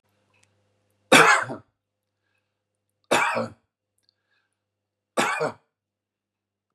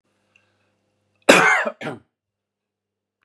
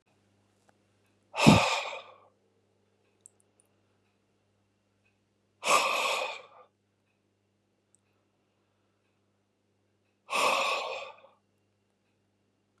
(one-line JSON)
{"three_cough_length": "6.7 s", "three_cough_amplitude": 28483, "three_cough_signal_mean_std_ratio": 0.27, "cough_length": "3.2 s", "cough_amplitude": 32768, "cough_signal_mean_std_ratio": 0.28, "exhalation_length": "12.8 s", "exhalation_amplitude": 23801, "exhalation_signal_mean_std_ratio": 0.27, "survey_phase": "beta (2021-08-13 to 2022-03-07)", "age": "65+", "gender": "Male", "wearing_mask": "No", "symptom_abdominal_pain": true, "symptom_fatigue": true, "symptom_onset": "12 days", "smoker_status": "Never smoked", "respiratory_condition_asthma": false, "respiratory_condition_other": false, "recruitment_source": "REACT", "submission_delay": "1 day", "covid_test_result": "Negative", "covid_test_method": "RT-qPCR"}